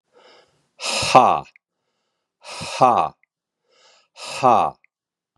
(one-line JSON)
{"exhalation_length": "5.4 s", "exhalation_amplitude": 32768, "exhalation_signal_mean_std_ratio": 0.35, "survey_phase": "beta (2021-08-13 to 2022-03-07)", "age": "45-64", "gender": "Male", "wearing_mask": "No", "symptom_cough_any": true, "symptom_runny_or_blocked_nose": true, "symptom_shortness_of_breath": true, "symptom_sore_throat": true, "symptom_fatigue": true, "symptom_headache": true, "smoker_status": "Ex-smoker", "respiratory_condition_asthma": false, "respiratory_condition_other": false, "recruitment_source": "Test and Trace", "submission_delay": "2 days", "covid_test_result": "Positive", "covid_test_method": "RT-qPCR", "covid_ct_value": 26.3, "covid_ct_gene": "N gene"}